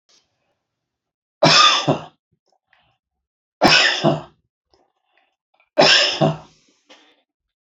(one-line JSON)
{"three_cough_length": "7.8 s", "three_cough_amplitude": 31584, "three_cough_signal_mean_std_ratio": 0.36, "survey_phase": "beta (2021-08-13 to 2022-03-07)", "age": "65+", "gender": "Male", "wearing_mask": "No", "symptom_cough_any": true, "smoker_status": "Never smoked", "respiratory_condition_asthma": false, "respiratory_condition_other": true, "recruitment_source": "REACT", "submission_delay": "1 day", "covid_test_result": "Negative", "covid_test_method": "RT-qPCR"}